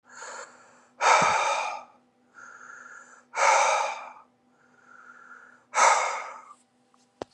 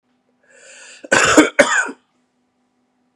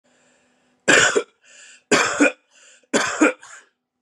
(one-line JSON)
{"exhalation_length": "7.3 s", "exhalation_amplitude": 16300, "exhalation_signal_mean_std_ratio": 0.44, "cough_length": "3.2 s", "cough_amplitude": 32768, "cough_signal_mean_std_ratio": 0.35, "three_cough_length": "4.0 s", "three_cough_amplitude": 26832, "three_cough_signal_mean_std_ratio": 0.41, "survey_phase": "beta (2021-08-13 to 2022-03-07)", "age": "18-44", "gender": "Male", "wearing_mask": "No", "symptom_cough_any": true, "symptom_runny_or_blocked_nose": true, "symptom_change_to_sense_of_smell_or_taste": true, "symptom_loss_of_taste": true, "symptom_onset": "3 days", "smoker_status": "Never smoked", "respiratory_condition_asthma": false, "respiratory_condition_other": false, "recruitment_source": "Test and Trace", "submission_delay": "2 days", "covid_test_result": "Positive", "covid_test_method": "RT-qPCR", "covid_ct_value": 20.1, "covid_ct_gene": "N gene"}